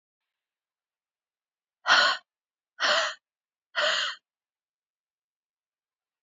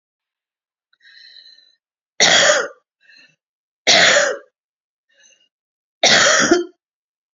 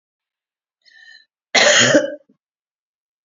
{"exhalation_length": "6.2 s", "exhalation_amplitude": 15860, "exhalation_signal_mean_std_ratio": 0.3, "three_cough_length": "7.3 s", "three_cough_amplitude": 32768, "three_cough_signal_mean_std_ratio": 0.38, "cough_length": "3.2 s", "cough_amplitude": 32768, "cough_signal_mean_std_ratio": 0.34, "survey_phase": "beta (2021-08-13 to 2022-03-07)", "age": "45-64", "gender": "Female", "wearing_mask": "No", "symptom_runny_or_blocked_nose": true, "symptom_shortness_of_breath": true, "symptom_sore_throat": true, "symptom_fatigue": true, "symptom_change_to_sense_of_smell_or_taste": true, "symptom_onset": "3 days", "smoker_status": "Ex-smoker", "respiratory_condition_asthma": false, "respiratory_condition_other": false, "recruitment_source": "Test and Trace", "submission_delay": "1 day", "covid_test_result": "Positive", "covid_test_method": "RT-qPCR", "covid_ct_value": 24.5, "covid_ct_gene": "ORF1ab gene"}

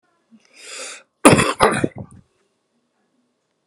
{"cough_length": "3.7 s", "cough_amplitude": 32768, "cough_signal_mean_std_ratio": 0.29, "survey_phase": "beta (2021-08-13 to 2022-03-07)", "age": "45-64", "gender": "Male", "wearing_mask": "No", "symptom_cough_any": true, "symptom_new_continuous_cough": true, "symptom_shortness_of_breath": true, "symptom_sore_throat": true, "symptom_headache": true, "symptom_onset": "4 days", "smoker_status": "Never smoked", "respiratory_condition_asthma": false, "respiratory_condition_other": false, "recruitment_source": "REACT", "submission_delay": "1 day", "covid_test_result": "Negative", "covid_test_method": "RT-qPCR"}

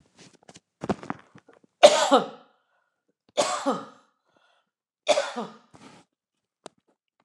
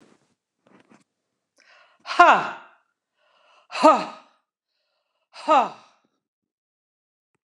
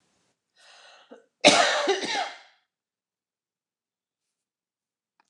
{"three_cough_length": "7.2 s", "three_cough_amplitude": 29203, "three_cough_signal_mean_std_ratio": 0.26, "exhalation_length": "7.4 s", "exhalation_amplitude": 29203, "exhalation_signal_mean_std_ratio": 0.24, "cough_length": "5.3 s", "cough_amplitude": 24542, "cough_signal_mean_std_ratio": 0.28, "survey_phase": "beta (2021-08-13 to 2022-03-07)", "age": "65+", "gender": "Female", "wearing_mask": "No", "symptom_cough_any": true, "symptom_shortness_of_breath": true, "smoker_status": "Ex-smoker", "respiratory_condition_asthma": false, "respiratory_condition_other": true, "recruitment_source": "REACT", "submission_delay": "3 days", "covid_test_result": "Negative", "covid_test_method": "RT-qPCR", "influenza_a_test_result": "Negative", "influenza_b_test_result": "Negative"}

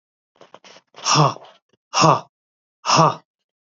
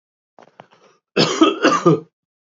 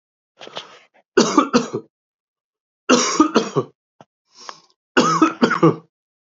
{"exhalation_length": "3.8 s", "exhalation_amplitude": 28116, "exhalation_signal_mean_std_ratio": 0.37, "cough_length": "2.6 s", "cough_amplitude": 28649, "cough_signal_mean_std_ratio": 0.42, "three_cough_length": "6.4 s", "three_cough_amplitude": 32768, "three_cough_signal_mean_std_ratio": 0.4, "survey_phase": "alpha (2021-03-01 to 2021-08-12)", "age": "45-64", "gender": "Male", "wearing_mask": "No", "symptom_cough_any": true, "symptom_fatigue": true, "symptom_change_to_sense_of_smell_or_taste": true, "symptom_loss_of_taste": true, "symptom_onset": "3 days", "smoker_status": "Ex-smoker", "respiratory_condition_asthma": false, "respiratory_condition_other": false, "recruitment_source": "Test and Trace", "submission_delay": "2 days", "covid_test_result": "Positive", "covid_test_method": "RT-qPCR", "covid_ct_value": 16.0, "covid_ct_gene": "ORF1ab gene", "covid_ct_mean": 16.3, "covid_viral_load": "4500000 copies/ml", "covid_viral_load_category": "High viral load (>1M copies/ml)"}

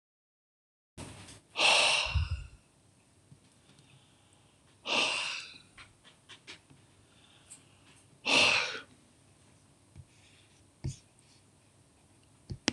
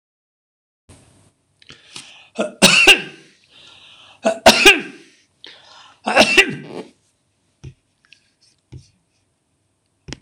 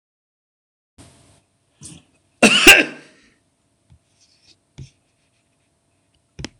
{"exhalation_length": "12.7 s", "exhalation_amplitude": 16330, "exhalation_signal_mean_std_ratio": 0.34, "three_cough_length": "10.2 s", "three_cough_amplitude": 26028, "three_cough_signal_mean_std_ratio": 0.29, "cough_length": "6.6 s", "cough_amplitude": 26028, "cough_signal_mean_std_ratio": 0.2, "survey_phase": "alpha (2021-03-01 to 2021-08-12)", "age": "45-64", "gender": "Male", "wearing_mask": "No", "symptom_none": true, "smoker_status": "Never smoked", "respiratory_condition_asthma": false, "respiratory_condition_other": false, "recruitment_source": "REACT", "submission_delay": "2 days", "covid_test_result": "Negative", "covid_test_method": "RT-qPCR"}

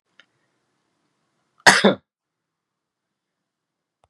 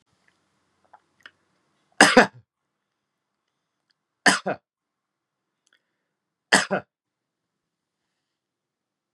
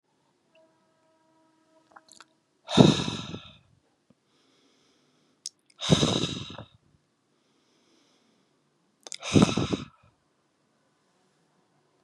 {"cough_length": "4.1 s", "cough_amplitude": 32768, "cough_signal_mean_std_ratio": 0.18, "three_cough_length": "9.1 s", "three_cough_amplitude": 32768, "three_cough_signal_mean_std_ratio": 0.17, "exhalation_length": "12.0 s", "exhalation_amplitude": 29141, "exhalation_signal_mean_std_ratio": 0.24, "survey_phase": "beta (2021-08-13 to 2022-03-07)", "age": "45-64", "gender": "Male", "wearing_mask": "No", "symptom_cough_any": true, "symptom_runny_or_blocked_nose": true, "smoker_status": "Never smoked", "respiratory_condition_asthma": false, "respiratory_condition_other": false, "recruitment_source": "Test and Trace", "submission_delay": "2 days", "covid_test_result": "Positive", "covid_test_method": "ePCR"}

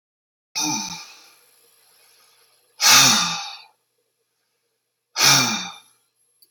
{"exhalation_length": "6.5 s", "exhalation_amplitude": 31872, "exhalation_signal_mean_std_ratio": 0.35, "survey_phase": "beta (2021-08-13 to 2022-03-07)", "age": "45-64", "gender": "Male", "wearing_mask": "No", "symptom_none": true, "smoker_status": "Ex-smoker", "respiratory_condition_asthma": false, "respiratory_condition_other": false, "recruitment_source": "REACT", "submission_delay": "1 day", "covid_test_result": "Negative", "covid_test_method": "RT-qPCR"}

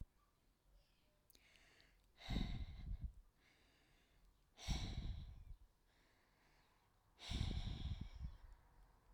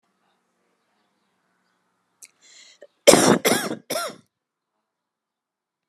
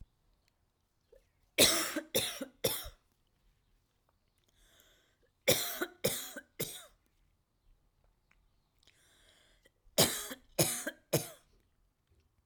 {"exhalation_length": "9.1 s", "exhalation_amplitude": 1225, "exhalation_signal_mean_std_ratio": 0.49, "cough_length": "5.9 s", "cough_amplitude": 32768, "cough_signal_mean_std_ratio": 0.24, "three_cough_length": "12.5 s", "three_cough_amplitude": 12511, "three_cough_signal_mean_std_ratio": 0.3, "survey_phase": "alpha (2021-03-01 to 2021-08-12)", "age": "18-44", "gender": "Female", "wearing_mask": "No", "symptom_none": true, "smoker_status": "Ex-smoker", "respiratory_condition_asthma": true, "respiratory_condition_other": false, "recruitment_source": "REACT", "submission_delay": "1 day", "covid_test_result": "Negative", "covid_test_method": "RT-qPCR", "covid_ct_value": 40.0, "covid_ct_gene": "N gene"}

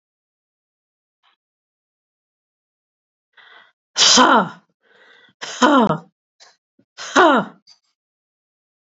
{"exhalation_length": "9.0 s", "exhalation_amplitude": 32768, "exhalation_signal_mean_std_ratio": 0.29, "survey_phase": "alpha (2021-03-01 to 2021-08-12)", "age": "65+", "gender": "Female", "wearing_mask": "No", "symptom_none": true, "smoker_status": "Ex-smoker", "respiratory_condition_asthma": false, "respiratory_condition_other": false, "recruitment_source": "REACT", "submission_delay": "3 days", "covid_test_result": "Negative", "covid_test_method": "RT-qPCR"}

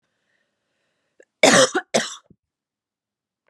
{"cough_length": "3.5 s", "cough_amplitude": 29612, "cough_signal_mean_std_ratio": 0.27, "survey_phase": "alpha (2021-03-01 to 2021-08-12)", "age": "45-64", "gender": "Female", "wearing_mask": "No", "symptom_cough_any": true, "symptom_abdominal_pain": true, "symptom_fatigue": true, "symptom_headache": true, "symptom_change_to_sense_of_smell_or_taste": true, "smoker_status": "Never smoked", "respiratory_condition_asthma": false, "respiratory_condition_other": false, "recruitment_source": "Test and Trace", "submission_delay": "2 days", "covid_test_result": "Positive", "covid_test_method": "RT-qPCR", "covid_ct_value": 15.7, "covid_ct_gene": "ORF1ab gene", "covid_ct_mean": 16.1, "covid_viral_load": "5200000 copies/ml", "covid_viral_load_category": "High viral load (>1M copies/ml)"}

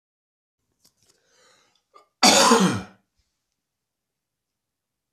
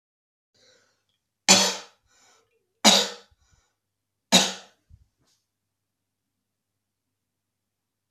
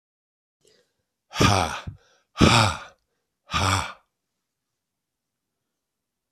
{"cough_length": "5.1 s", "cough_amplitude": 25340, "cough_signal_mean_std_ratio": 0.27, "three_cough_length": "8.1 s", "three_cough_amplitude": 27722, "three_cough_signal_mean_std_ratio": 0.21, "exhalation_length": "6.3 s", "exhalation_amplitude": 24589, "exhalation_signal_mean_std_ratio": 0.32, "survey_phase": "beta (2021-08-13 to 2022-03-07)", "age": "65+", "gender": "Male", "wearing_mask": "No", "symptom_runny_or_blocked_nose": true, "symptom_fatigue": true, "symptom_onset": "4 days", "smoker_status": "Ex-smoker", "respiratory_condition_asthma": false, "respiratory_condition_other": false, "recruitment_source": "Test and Trace", "submission_delay": "2 days", "covid_test_result": "Positive", "covid_test_method": "RT-qPCR", "covid_ct_value": 35.0, "covid_ct_gene": "N gene"}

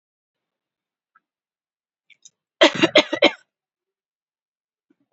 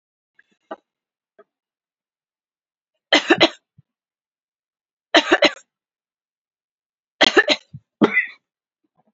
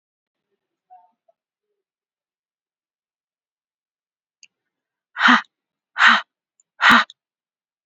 {"cough_length": "5.1 s", "cough_amplitude": 32767, "cough_signal_mean_std_ratio": 0.2, "three_cough_length": "9.1 s", "three_cough_amplitude": 32768, "three_cough_signal_mean_std_ratio": 0.24, "exhalation_length": "7.9 s", "exhalation_amplitude": 29293, "exhalation_signal_mean_std_ratio": 0.22, "survey_phase": "beta (2021-08-13 to 2022-03-07)", "age": "18-44", "gender": "Female", "wearing_mask": "No", "symptom_none": true, "smoker_status": "Never smoked", "respiratory_condition_asthma": false, "respiratory_condition_other": false, "recruitment_source": "REACT", "submission_delay": "1 day", "covid_test_result": "Negative", "covid_test_method": "RT-qPCR"}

